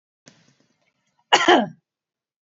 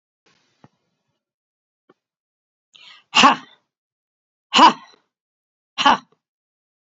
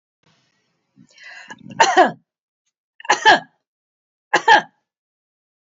cough_length: 2.6 s
cough_amplitude: 29588
cough_signal_mean_std_ratio: 0.26
exhalation_length: 7.0 s
exhalation_amplitude: 30315
exhalation_signal_mean_std_ratio: 0.21
three_cough_length: 5.7 s
three_cough_amplitude: 32768
three_cough_signal_mean_std_ratio: 0.28
survey_phase: beta (2021-08-13 to 2022-03-07)
age: 45-64
gender: Female
wearing_mask: 'No'
symptom_none: true
smoker_status: Never smoked
respiratory_condition_asthma: false
respiratory_condition_other: false
recruitment_source: REACT
submission_delay: 1 day
covid_test_result: Negative
covid_test_method: RT-qPCR
influenza_a_test_result: Negative
influenza_b_test_result: Negative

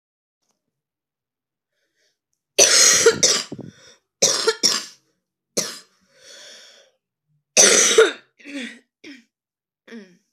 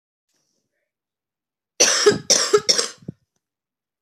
cough_length: 10.3 s
cough_amplitude: 32768
cough_signal_mean_std_ratio: 0.35
three_cough_length: 4.0 s
three_cough_amplitude: 30719
three_cough_signal_mean_std_ratio: 0.34
survey_phase: alpha (2021-03-01 to 2021-08-12)
age: 18-44
gender: Female
wearing_mask: 'No'
symptom_cough_any: true
symptom_new_continuous_cough: true
symptom_shortness_of_breath: true
symptom_abdominal_pain: true
symptom_fatigue: true
symptom_fever_high_temperature: true
symptom_headache: true
symptom_change_to_sense_of_smell_or_taste: true
symptom_loss_of_taste: true
smoker_status: Never smoked
respiratory_condition_asthma: false
respiratory_condition_other: false
recruitment_source: Test and Trace
submission_delay: 1 day
covid_test_result: Positive
covid_test_method: LFT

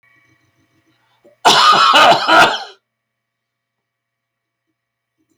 cough_length: 5.4 s
cough_amplitude: 32768
cough_signal_mean_std_ratio: 0.38
survey_phase: beta (2021-08-13 to 2022-03-07)
age: 65+
gender: Male
wearing_mask: 'No'
symptom_none: true
smoker_status: Ex-smoker
respiratory_condition_asthma: false
respiratory_condition_other: false
recruitment_source: REACT
submission_delay: 2 days
covid_test_result: Negative
covid_test_method: RT-qPCR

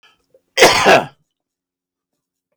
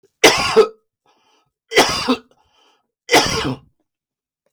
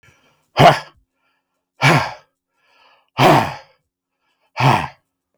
cough_length: 2.6 s
cough_amplitude: 32768
cough_signal_mean_std_ratio: 0.34
three_cough_length: 4.5 s
three_cough_amplitude: 32768
three_cough_signal_mean_std_ratio: 0.39
exhalation_length: 5.4 s
exhalation_amplitude: 32768
exhalation_signal_mean_std_ratio: 0.35
survey_phase: beta (2021-08-13 to 2022-03-07)
age: 65+
gender: Male
wearing_mask: 'No'
symptom_none: true
smoker_status: Ex-smoker
respiratory_condition_asthma: false
respiratory_condition_other: false
recruitment_source: REACT
submission_delay: 2 days
covid_test_result: Negative
covid_test_method: RT-qPCR
influenza_a_test_result: Negative
influenza_b_test_result: Negative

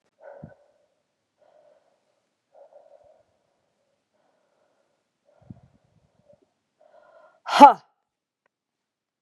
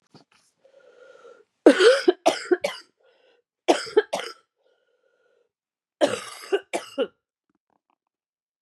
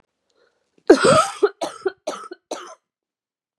exhalation_length: 9.2 s
exhalation_amplitude: 32768
exhalation_signal_mean_std_ratio: 0.12
three_cough_length: 8.6 s
three_cough_amplitude: 31507
three_cough_signal_mean_std_ratio: 0.28
cough_length: 3.6 s
cough_amplitude: 32767
cough_signal_mean_std_ratio: 0.32
survey_phase: beta (2021-08-13 to 2022-03-07)
age: 45-64
gender: Female
wearing_mask: 'No'
symptom_cough_any: true
symptom_runny_or_blocked_nose: true
symptom_sore_throat: true
symptom_fatigue: true
symptom_headache: true
symptom_change_to_sense_of_smell_or_taste: true
symptom_loss_of_taste: true
symptom_onset: 5 days
smoker_status: Never smoked
respiratory_condition_asthma: false
respiratory_condition_other: false
recruitment_source: Test and Trace
submission_delay: 2 days
covid_test_result: Positive
covid_test_method: RT-qPCR
covid_ct_value: 20.9
covid_ct_gene: N gene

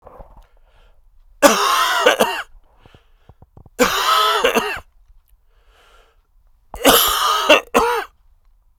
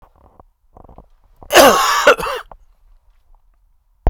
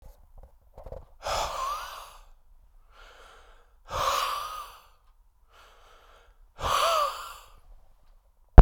three_cough_length: 8.8 s
three_cough_amplitude: 32768
three_cough_signal_mean_std_ratio: 0.47
cough_length: 4.1 s
cough_amplitude: 32768
cough_signal_mean_std_ratio: 0.34
exhalation_length: 8.6 s
exhalation_amplitude: 32768
exhalation_signal_mean_std_ratio: 0.24
survey_phase: beta (2021-08-13 to 2022-03-07)
age: 45-64
gender: Male
wearing_mask: 'No'
symptom_cough_any: true
symptom_shortness_of_breath: true
symptom_diarrhoea: true
symptom_fatigue: true
symptom_headache: true
symptom_change_to_sense_of_smell_or_taste: true
symptom_loss_of_taste: true
symptom_onset: 4 days
smoker_status: Never smoked
respiratory_condition_asthma: false
respiratory_condition_other: false
recruitment_source: Test and Trace
submission_delay: 3 days
covid_test_result: Positive
covid_test_method: RT-qPCR
covid_ct_value: 10.8
covid_ct_gene: N gene
covid_ct_mean: 11.4
covid_viral_load: 190000000 copies/ml
covid_viral_load_category: High viral load (>1M copies/ml)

